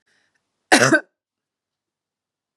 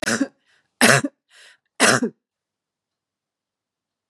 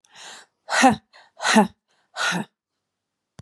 {"cough_length": "2.6 s", "cough_amplitude": 32767, "cough_signal_mean_std_ratio": 0.24, "three_cough_length": "4.1 s", "three_cough_amplitude": 32767, "three_cough_signal_mean_std_ratio": 0.3, "exhalation_length": "3.4 s", "exhalation_amplitude": 28207, "exhalation_signal_mean_std_ratio": 0.35, "survey_phase": "beta (2021-08-13 to 2022-03-07)", "age": "45-64", "gender": "Female", "wearing_mask": "No", "symptom_none": true, "smoker_status": "Ex-smoker", "respiratory_condition_asthma": false, "respiratory_condition_other": false, "recruitment_source": "REACT", "submission_delay": "2 days", "covid_test_result": "Negative", "covid_test_method": "RT-qPCR", "influenza_a_test_result": "Negative", "influenza_b_test_result": "Negative"}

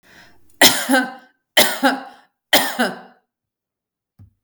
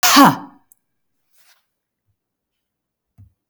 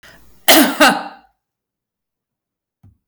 {"three_cough_length": "4.4 s", "three_cough_amplitude": 32768, "three_cough_signal_mean_std_ratio": 0.39, "exhalation_length": "3.5 s", "exhalation_amplitude": 32768, "exhalation_signal_mean_std_ratio": 0.25, "cough_length": "3.1 s", "cough_amplitude": 32768, "cough_signal_mean_std_ratio": 0.33, "survey_phase": "beta (2021-08-13 to 2022-03-07)", "age": "45-64", "gender": "Female", "wearing_mask": "No", "symptom_none": true, "smoker_status": "Never smoked", "respiratory_condition_asthma": false, "respiratory_condition_other": false, "recruitment_source": "REACT", "submission_delay": "1 day", "covid_test_result": "Negative", "covid_test_method": "RT-qPCR", "influenza_a_test_result": "Negative", "influenza_b_test_result": "Negative"}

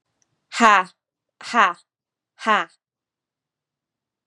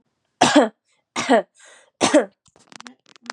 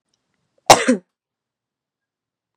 {"exhalation_length": "4.3 s", "exhalation_amplitude": 32767, "exhalation_signal_mean_std_ratio": 0.28, "three_cough_length": "3.3 s", "three_cough_amplitude": 29965, "three_cough_signal_mean_std_ratio": 0.36, "cough_length": "2.6 s", "cough_amplitude": 32768, "cough_signal_mean_std_ratio": 0.2, "survey_phase": "beta (2021-08-13 to 2022-03-07)", "age": "18-44", "gender": "Female", "wearing_mask": "No", "symptom_none": true, "smoker_status": "Never smoked", "respiratory_condition_asthma": false, "respiratory_condition_other": false, "recruitment_source": "REACT", "submission_delay": "4 days", "covid_test_result": "Negative", "covid_test_method": "RT-qPCR", "influenza_a_test_result": "Negative", "influenza_b_test_result": "Negative"}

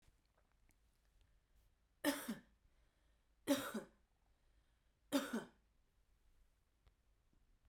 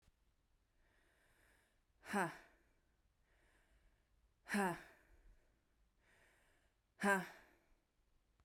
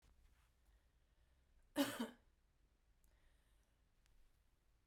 {"three_cough_length": "7.7 s", "three_cough_amplitude": 1983, "three_cough_signal_mean_std_ratio": 0.27, "exhalation_length": "8.4 s", "exhalation_amplitude": 2545, "exhalation_signal_mean_std_ratio": 0.26, "cough_length": "4.9 s", "cough_amplitude": 1537, "cough_signal_mean_std_ratio": 0.24, "survey_phase": "beta (2021-08-13 to 2022-03-07)", "age": "18-44", "gender": "Female", "wearing_mask": "No", "symptom_cough_any": true, "symptom_sore_throat": true, "symptom_fatigue": true, "smoker_status": "Never smoked", "respiratory_condition_asthma": false, "respiratory_condition_other": false, "recruitment_source": "Test and Trace", "submission_delay": "2 days", "covid_test_result": "Positive", "covid_test_method": "RT-qPCR"}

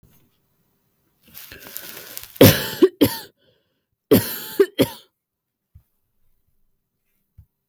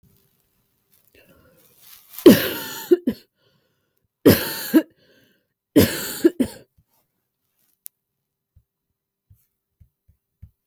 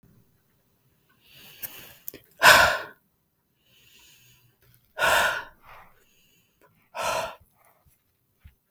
{"cough_length": "7.7 s", "cough_amplitude": 32768, "cough_signal_mean_std_ratio": 0.25, "three_cough_length": "10.7 s", "three_cough_amplitude": 32768, "three_cough_signal_mean_std_ratio": 0.24, "exhalation_length": "8.7 s", "exhalation_amplitude": 32766, "exhalation_signal_mean_std_ratio": 0.26, "survey_phase": "beta (2021-08-13 to 2022-03-07)", "age": "18-44", "gender": "Female", "wearing_mask": "No", "symptom_none": true, "smoker_status": "Never smoked", "respiratory_condition_asthma": false, "respiratory_condition_other": false, "recruitment_source": "REACT", "submission_delay": "2 days", "covid_test_result": "Negative", "covid_test_method": "RT-qPCR", "covid_ct_value": 40.0, "covid_ct_gene": "N gene", "influenza_a_test_result": "Negative", "influenza_b_test_result": "Negative"}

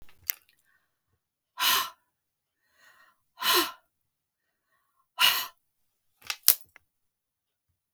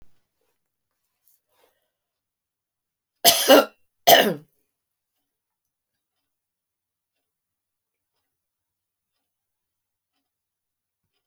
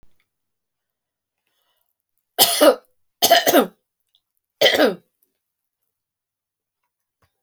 {"exhalation_length": "7.9 s", "exhalation_amplitude": 32768, "exhalation_signal_mean_std_ratio": 0.25, "cough_length": "11.3 s", "cough_amplitude": 32768, "cough_signal_mean_std_ratio": 0.17, "three_cough_length": "7.4 s", "three_cough_amplitude": 32768, "three_cough_signal_mean_std_ratio": 0.28, "survey_phase": "beta (2021-08-13 to 2022-03-07)", "age": "65+", "gender": "Female", "wearing_mask": "No", "symptom_none": true, "smoker_status": "Ex-smoker", "respiratory_condition_asthma": false, "respiratory_condition_other": false, "recruitment_source": "REACT", "submission_delay": "3 days", "covid_test_result": "Negative", "covid_test_method": "RT-qPCR"}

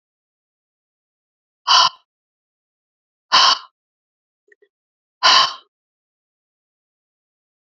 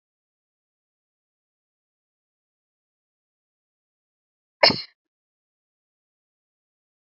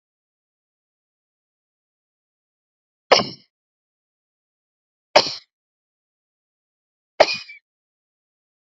{"exhalation_length": "7.8 s", "exhalation_amplitude": 32248, "exhalation_signal_mean_std_ratio": 0.24, "cough_length": "7.2 s", "cough_amplitude": 28030, "cough_signal_mean_std_ratio": 0.1, "three_cough_length": "8.7 s", "three_cough_amplitude": 27950, "three_cough_signal_mean_std_ratio": 0.15, "survey_phase": "beta (2021-08-13 to 2022-03-07)", "age": "65+", "gender": "Female", "wearing_mask": "No", "symptom_cough_any": true, "symptom_shortness_of_breath": true, "symptom_sore_throat": true, "symptom_onset": "6 days", "smoker_status": "Never smoked", "respiratory_condition_asthma": true, "respiratory_condition_other": false, "recruitment_source": "REACT", "submission_delay": "1 day", "covid_test_result": "Negative", "covid_test_method": "RT-qPCR"}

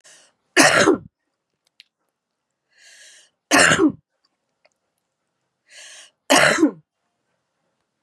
{"three_cough_length": "8.0 s", "three_cough_amplitude": 32767, "three_cough_signal_mean_std_ratio": 0.32, "survey_phase": "beta (2021-08-13 to 2022-03-07)", "age": "45-64", "gender": "Female", "wearing_mask": "No", "symptom_cough_any": true, "smoker_status": "Never smoked", "respiratory_condition_asthma": false, "respiratory_condition_other": false, "recruitment_source": "REACT", "submission_delay": "0 days", "covid_test_result": "Negative", "covid_test_method": "RT-qPCR", "influenza_a_test_result": "Negative", "influenza_b_test_result": "Negative"}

